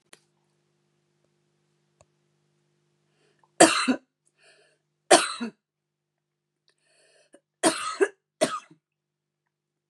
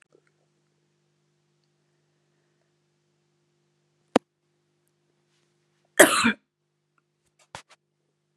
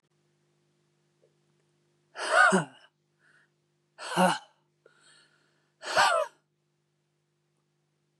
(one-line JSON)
{"three_cough_length": "9.9 s", "three_cough_amplitude": 32610, "three_cough_signal_mean_std_ratio": 0.21, "cough_length": "8.4 s", "cough_amplitude": 32767, "cough_signal_mean_std_ratio": 0.14, "exhalation_length": "8.2 s", "exhalation_amplitude": 13285, "exhalation_signal_mean_std_ratio": 0.28, "survey_phase": "beta (2021-08-13 to 2022-03-07)", "age": "18-44", "gender": "Female", "wearing_mask": "No", "symptom_cough_any": true, "symptom_runny_or_blocked_nose": true, "symptom_sore_throat": true, "symptom_fatigue": true, "symptom_headache": true, "symptom_change_to_sense_of_smell_or_taste": true, "symptom_loss_of_taste": true, "symptom_other": true, "symptom_onset": "3 days", "smoker_status": "Ex-smoker", "respiratory_condition_asthma": true, "respiratory_condition_other": false, "recruitment_source": "Test and Trace", "submission_delay": "2 days", "covid_test_result": "Positive", "covid_test_method": "RT-qPCR", "covid_ct_value": 25.6, "covid_ct_gene": "ORF1ab gene", "covid_ct_mean": 25.6, "covid_viral_load": "4000 copies/ml", "covid_viral_load_category": "Minimal viral load (< 10K copies/ml)"}